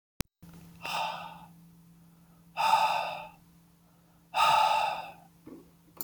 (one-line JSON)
{"exhalation_length": "6.0 s", "exhalation_amplitude": 10918, "exhalation_signal_mean_std_ratio": 0.46, "survey_phase": "beta (2021-08-13 to 2022-03-07)", "age": "18-44", "gender": "Male", "wearing_mask": "No", "symptom_cough_any": true, "symptom_runny_or_blocked_nose": true, "symptom_onset": "2 days", "smoker_status": "Never smoked", "respiratory_condition_asthma": false, "respiratory_condition_other": false, "recruitment_source": "Test and Trace", "submission_delay": "1 day", "covid_test_result": "Negative", "covid_test_method": "RT-qPCR"}